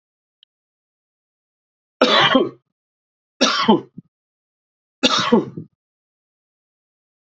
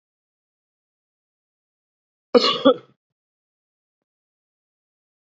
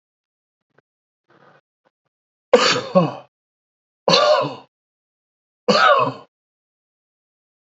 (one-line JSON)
{"three_cough_length": "7.3 s", "three_cough_amplitude": 29651, "three_cough_signal_mean_std_ratio": 0.32, "cough_length": "5.2 s", "cough_amplitude": 27774, "cough_signal_mean_std_ratio": 0.18, "exhalation_length": "7.8 s", "exhalation_amplitude": 29302, "exhalation_signal_mean_std_ratio": 0.33, "survey_phase": "beta (2021-08-13 to 2022-03-07)", "age": "65+", "gender": "Male", "wearing_mask": "No", "symptom_cough_any": true, "symptom_runny_or_blocked_nose": true, "symptom_sore_throat": true, "symptom_diarrhoea": true, "symptom_fatigue": true, "symptom_headache": true, "symptom_onset": "3 days", "smoker_status": "Never smoked", "respiratory_condition_asthma": false, "respiratory_condition_other": false, "recruitment_source": "Test and Trace", "submission_delay": "1 day", "covid_test_result": "Positive", "covid_test_method": "RT-qPCR", "covid_ct_value": 24.8, "covid_ct_gene": "ORF1ab gene", "covid_ct_mean": 25.2, "covid_viral_load": "5500 copies/ml", "covid_viral_load_category": "Minimal viral load (< 10K copies/ml)"}